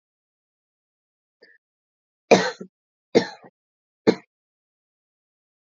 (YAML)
three_cough_length: 5.7 s
three_cough_amplitude: 27490
three_cough_signal_mean_std_ratio: 0.17
survey_phase: beta (2021-08-13 to 2022-03-07)
age: 18-44
gender: Female
wearing_mask: 'No'
symptom_none: true
smoker_status: Ex-smoker
respiratory_condition_asthma: false
respiratory_condition_other: false
recruitment_source: Test and Trace
submission_delay: 1 day
covid_test_result: Negative
covid_test_method: RT-qPCR